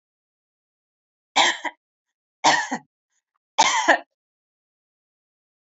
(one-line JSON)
{"three_cough_length": "5.7 s", "three_cough_amplitude": 24480, "three_cough_signal_mean_std_ratio": 0.29, "survey_phase": "beta (2021-08-13 to 2022-03-07)", "age": "65+", "gender": "Female", "wearing_mask": "No", "symptom_runny_or_blocked_nose": true, "smoker_status": "Ex-smoker", "respiratory_condition_asthma": false, "respiratory_condition_other": false, "recruitment_source": "REACT", "submission_delay": "2 days", "covid_test_result": "Negative", "covid_test_method": "RT-qPCR", "influenza_a_test_result": "Negative", "influenza_b_test_result": "Negative"}